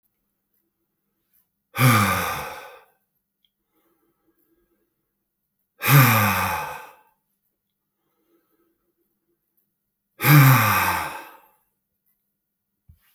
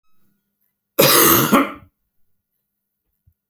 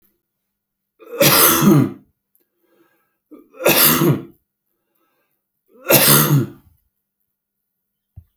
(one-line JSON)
{"exhalation_length": "13.1 s", "exhalation_amplitude": 27791, "exhalation_signal_mean_std_ratio": 0.32, "cough_length": "3.5 s", "cough_amplitude": 32768, "cough_signal_mean_std_ratio": 0.36, "three_cough_length": "8.4 s", "three_cough_amplitude": 32768, "three_cough_signal_mean_std_ratio": 0.4, "survey_phase": "beta (2021-08-13 to 2022-03-07)", "age": "45-64", "gender": "Male", "wearing_mask": "No", "symptom_sore_throat": true, "symptom_onset": "9 days", "smoker_status": "Ex-smoker", "respiratory_condition_asthma": true, "respiratory_condition_other": false, "recruitment_source": "REACT", "submission_delay": "6 days", "covid_test_result": "Negative", "covid_test_method": "RT-qPCR"}